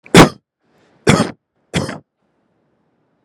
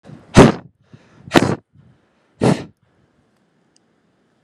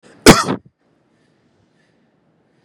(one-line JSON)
{"three_cough_length": "3.2 s", "three_cough_amplitude": 32768, "three_cough_signal_mean_std_ratio": 0.28, "exhalation_length": "4.4 s", "exhalation_amplitude": 32768, "exhalation_signal_mean_std_ratio": 0.26, "cough_length": "2.6 s", "cough_amplitude": 32768, "cough_signal_mean_std_ratio": 0.22, "survey_phase": "beta (2021-08-13 to 2022-03-07)", "age": "18-44", "gender": "Male", "wearing_mask": "No", "symptom_none": true, "smoker_status": "Never smoked", "respiratory_condition_asthma": false, "respiratory_condition_other": false, "recruitment_source": "REACT", "submission_delay": "1 day", "covid_test_result": "Negative", "covid_test_method": "RT-qPCR", "influenza_a_test_result": "Unknown/Void", "influenza_b_test_result": "Unknown/Void"}